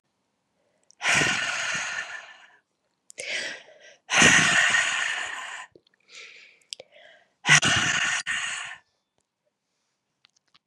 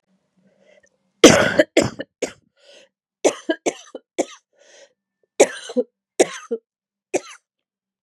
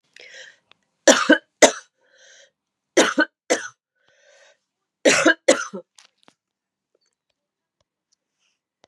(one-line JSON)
{"exhalation_length": "10.7 s", "exhalation_amplitude": 28046, "exhalation_signal_mean_std_ratio": 0.45, "cough_length": "8.0 s", "cough_amplitude": 32768, "cough_signal_mean_std_ratio": 0.26, "three_cough_length": "8.9 s", "three_cough_amplitude": 32768, "three_cough_signal_mean_std_ratio": 0.26, "survey_phase": "beta (2021-08-13 to 2022-03-07)", "age": "45-64", "gender": "Female", "wearing_mask": "No", "symptom_cough_any": true, "symptom_new_continuous_cough": true, "symptom_runny_or_blocked_nose": true, "symptom_headache": true, "symptom_change_to_sense_of_smell_or_taste": true, "symptom_loss_of_taste": true, "symptom_onset": "3 days", "smoker_status": "Never smoked", "respiratory_condition_asthma": false, "respiratory_condition_other": false, "recruitment_source": "Test and Trace", "submission_delay": "2 days", "covid_test_result": "Positive", "covid_test_method": "ePCR"}